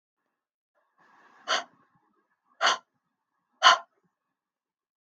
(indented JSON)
{
  "exhalation_length": "5.1 s",
  "exhalation_amplitude": 23307,
  "exhalation_signal_mean_std_ratio": 0.21,
  "survey_phase": "beta (2021-08-13 to 2022-03-07)",
  "age": "45-64",
  "gender": "Female",
  "wearing_mask": "No",
  "symptom_none": true,
  "smoker_status": "Never smoked",
  "respiratory_condition_asthma": false,
  "respiratory_condition_other": false,
  "recruitment_source": "REACT",
  "submission_delay": "3 days",
  "covid_test_result": "Negative",
  "covid_test_method": "RT-qPCR",
  "influenza_a_test_result": "Negative",
  "influenza_b_test_result": "Negative"
}